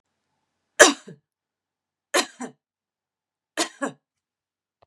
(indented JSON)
{
  "three_cough_length": "4.9 s",
  "three_cough_amplitude": 32768,
  "three_cough_signal_mean_std_ratio": 0.19,
  "survey_phase": "beta (2021-08-13 to 2022-03-07)",
  "age": "45-64",
  "gender": "Female",
  "wearing_mask": "No",
  "symptom_cough_any": true,
  "symptom_runny_or_blocked_nose": true,
  "symptom_abdominal_pain": true,
  "symptom_headache": true,
  "symptom_other": true,
  "symptom_onset": "5 days",
  "smoker_status": "Never smoked",
  "respiratory_condition_asthma": false,
  "respiratory_condition_other": false,
  "recruitment_source": "Test and Trace",
  "submission_delay": "1 day",
  "covid_test_result": "Positive",
  "covid_test_method": "RT-qPCR",
  "covid_ct_value": 27.3,
  "covid_ct_gene": "ORF1ab gene"
}